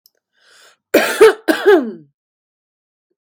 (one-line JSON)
{"cough_length": "3.3 s", "cough_amplitude": 32768, "cough_signal_mean_std_ratio": 0.35, "survey_phase": "beta (2021-08-13 to 2022-03-07)", "age": "18-44", "gender": "Female", "wearing_mask": "No", "symptom_runny_or_blocked_nose": true, "smoker_status": "Current smoker (1 to 10 cigarettes per day)", "respiratory_condition_asthma": false, "respiratory_condition_other": false, "recruitment_source": "REACT", "submission_delay": "1 day", "covid_test_result": "Negative", "covid_test_method": "RT-qPCR"}